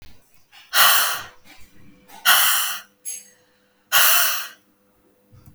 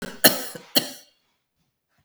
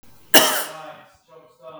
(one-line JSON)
{"exhalation_length": "5.5 s", "exhalation_amplitude": 31110, "exhalation_signal_mean_std_ratio": 0.45, "three_cough_length": "2.0 s", "three_cough_amplitude": 32768, "three_cough_signal_mean_std_ratio": 0.27, "cough_length": "1.8 s", "cough_amplitude": 32768, "cough_signal_mean_std_ratio": 0.34, "survey_phase": "beta (2021-08-13 to 2022-03-07)", "age": "45-64", "gender": "Female", "wearing_mask": "No", "symptom_none": true, "smoker_status": "Never smoked", "respiratory_condition_asthma": false, "respiratory_condition_other": false, "recruitment_source": "REACT", "submission_delay": "1 day", "covid_test_result": "Negative", "covid_test_method": "RT-qPCR", "covid_ct_value": 48.0, "covid_ct_gene": "N gene"}